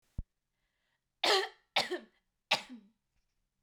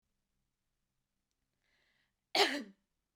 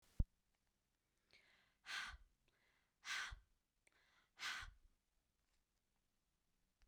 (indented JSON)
{
  "three_cough_length": "3.6 s",
  "three_cough_amplitude": 6218,
  "three_cough_signal_mean_std_ratio": 0.3,
  "cough_length": "3.2 s",
  "cough_amplitude": 5868,
  "cough_signal_mean_std_ratio": 0.21,
  "exhalation_length": "6.9 s",
  "exhalation_amplitude": 2019,
  "exhalation_signal_mean_std_ratio": 0.26,
  "survey_phase": "beta (2021-08-13 to 2022-03-07)",
  "age": "18-44",
  "gender": "Female",
  "wearing_mask": "No",
  "symptom_fatigue": true,
  "symptom_onset": "3 days",
  "smoker_status": "Never smoked",
  "respiratory_condition_asthma": false,
  "respiratory_condition_other": false,
  "recruitment_source": "REACT",
  "submission_delay": "2 days",
  "covid_test_result": "Negative",
  "covid_test_method": "RT-qPCR",
  "influenza_a_test_result": "Negative",
  "influenza_b_test_result": "Negative"
}